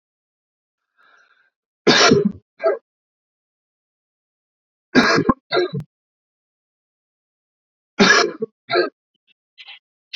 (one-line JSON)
{"three_cough_length": "10.2 s", "three_cough_amplitude": 30878, "three_cough_signal_mean_std_ratio": 0.32, "survey_phase": "beta (2021-08-13 to 2022-03-07)", "age": "18-44", "gender": "Male", "wearing_mask": "No", "symptom_sore_throat": true, "symptom_headache": true, "smoker_status": "Never smoked", "respiratory_condition_asthma": false, "respiratory_condition_other": false, "recruitment_source": "Test and Trace", "submission_delay": "1 day", "covid_test_result": "Positive", "covid_test_method": "RT-qPCR", "covid_ct_value": 13.7, "covid_ct_gene": "ORF1ab gene"}